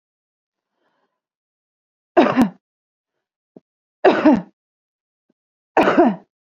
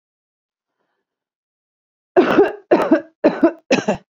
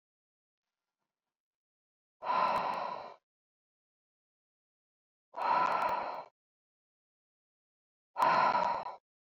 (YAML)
three_cough_length: 6.5 s
three_cough_amplitude: 27386
three_cough_signal_mean_std_ratio: 0.31
cough_length: 4.1 s
cough_amplitude: 30828
cough_signal_mean_std_ratio: 0.39
exhalation_length: 9.2 s
exhalation_amplitude: 4569
exhalation_signal_mean_std_ratio: 0.4
survey_phase: beta (2021-08-13 to 2022-03-07)
age: 18-44
gender: Female
wearing_mask: 'No'
symptom_none: true
smoker_status: Current smoker (11 or more cigarettes per day)
respiratory_condition_asthma: false
respiratory_condition_other: false
recruitment_source: REACT
submission_delay: 3 days
covid_test_result: Negative
covid_test_method: RT-qPCR
influenza_a_test_result: Negative
influenza_b_test_result: Negative